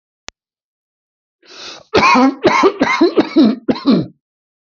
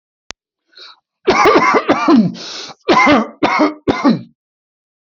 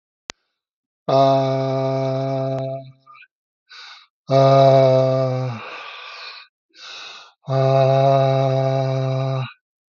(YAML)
cough_length: 4.6 s
cough_amplitude: 29215
cough_signal_mean_std_ratio: 0.51
three_cough_length: 5.0 s
three_cough_amplitude: 31415
three_cough_signal_mean_std_ratio: 0.56
exhalation_length: 9.9 s
exhalation_amplitude: 25077
exhalation_signal_mean_std_ratio: 0.62
survey_phase: alpha (2021-03-01 to 2021-08-12)
age: 45-64
gender: Male
wearing_mask: 'No'
symptom_none: true
smoker_status: Ex-smoker
respiratory_condition_asthma: false
respiratory_condition_other: false
recruitment_source: REACT
submission_delay: 10 days
covid_test_result: Negative
covid_test_method: RT-qPCR
covid_ct_value: 39.0
covid_ct_gene: N gene